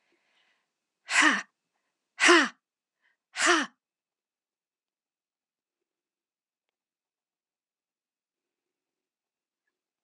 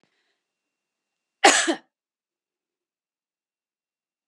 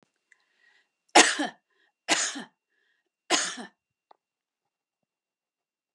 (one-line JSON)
{"exhalation_length": "10.0 s", "exhalation_amplitude": 16971, "exhalation_signal_mean_std_ratio": 0.22, "cough_length": "4.3 s", "cough_amplitude": 30564, "cough_signal_mean_std_ratio": 0.18, "three_cough_length": "5.9 s", "three_cough_amplitude": 25207, "three_cough_signal_mean_std_ratio": 0.24, "survey_phase": "beta (2021-08-13 to 2022-03-07)", "age": "45-64", "gender": "Female", "wearing_mask": "No", "symptom_other": true, "symptom_onset": "12 days", "smoker_status": "Never smoked", "respiratory_condition_asthma": false, "respiratory_condition_other": false, "recruitment_source": "REACT", "submission_delay": "1 day", "covid_test_result": "Negative", "covid_test_method": "RT-qPCR"}